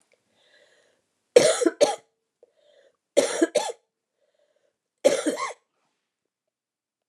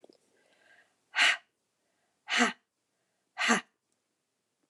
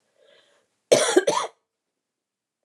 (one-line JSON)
{"three_cough_length": "7.1 s", "three_cough_amplitude": 28762, "three_cough_signal_mean_std_ratio": 0.29, "exhalation_length": "4.7 s", "exhalation_amplitude": 10100, "exhalation_signal_mean_std_ratio": 0.29, "cough_length": "2.6 s", "cough_amplitude": 24846, "cough_signal_mean_std_ratio": 0.31, "survey_phase": "beta (2021-08-13 to 2022-03-07)", "age": "65+", "gender": "Female", "wearing_mask": "No", "symptom_cough_any": true, "symptom_new_continuous_cough": true, "symptom_runny_or_blocked_nose": true, "symptom_fatigue": true, "symptom_onset": "8 days", "smoker_status": "Never smoked", "respiratory_condition_asthma": false, "respiratory_condition_other": false, "recruitment_source": "Test and Trace", "submission_delay": "1 day", "covid_test_result": "Positive", "covid_test_method": "RT-qPCR", "covid_ct_value": 16.7, "covid_ct_gene": "ORF1ab gene", "covid_ct_mean": 17.1, "covid_viral_load": "2400000 copies/ml", "covid_viral_load_category": "High viral load (>1M copies/ml)"}